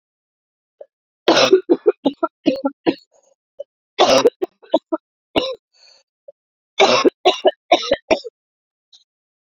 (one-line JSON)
{"three_cough_length": "9.5 s", "three_cough_amplitude": 32768, "three_cough_signal_mean_std_ratio": 0.36, "survey_phase": "beta (2021-08-13 to 2022-03-07)", "age": "18-44", "gender": "Female", "wearing_mask": "No", "symptom_cough_any": true, "symptom_new_continuous_cough": true, "symptom_runny_or_blocked_nose": true, "symptom_shortness_of_breath": true, "symptom_fatigue": true, "symptom_fever_high_temperature": true, "symptom_headache": true, "symptom_change_to_sense_of_smell_or_taste": true, "symptom_loss_of_taste": true, "symptom_onset": "4 days", "smoker_status": "Never smoked", "respiratory_condition_asthma": false, "respiratory_condition_other": false, "recruitment_source": "Test and Trace", "submission_delay": "1 day", "covid_test_result": "Positive", "covid_test_method": "RT-qPCR"}